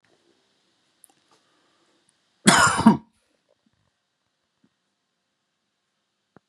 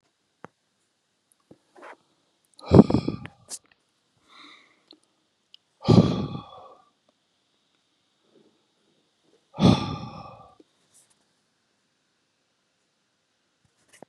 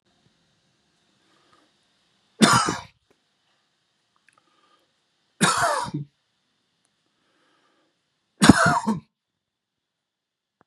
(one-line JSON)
{"cough_length": "6.5 s", "cough_amplitude": 32649, "cough_signal_mean_std_ratio": 0.2, "exhalation_length": "14.1 s", "exhalation_amplitude": 31562, "exhalation_signal_mean_std_ratio": 0.19, "three_cough_length": "10.7 s", "three_cough_amplitude": 32768, "three_cough_signal_mean_std_ratio": 0.25, "survey_phase": "beta (2021-08-13 to 2022-03-07)", "age": "45-64", "gender": "Male", "wearing_mask": "No", "symptom_none": true, "smoker_status": "Never smoked", "respiratory_condition_asthma": false, "respiratory_condition_other": false, "recruitment_source": "REACT", "submission_delay": "2 days", "covid_test_result": "Negative", "covid_test_method": "RT-qPCR", "influenza_a_test_result": "Negative", "influenza_b_test_result": "Negative"}